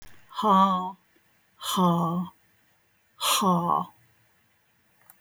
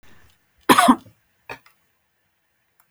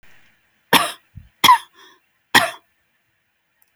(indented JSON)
{
  "exhalation_length": "5.2 s",
  "exhalation_amplitude": 11823,
  "exhalation_signal_mean_std_ratio": 0.5,
  "cough_length": "2.9 s",
  "cough_amplitude": 32768,
  "cough_signal_mean_std_ratio": 0.24,
  "three_cough_length": "3.8 s",
  "three_cough_amplitude": 32768,
  "three_cough_signal_mean_std_ratio": 0.26,
  "survey_phase": "alpha (2021-03-01 to 2021-08-12)",
  "age": "65+",
  "gender": "Female",
  "wearing_mask": "No",
  "symptom_none": true,
  "smoker_status": "Never smoked",
  "respiratory_condition_asthma": false,
  "respiratory_condition_other": false,
  "recruitment_source": "REACT",
  "submission_delay": "1 day",
  "covid_test_result": "Negative",
  "covid_test_method": "RT-qPCR"
}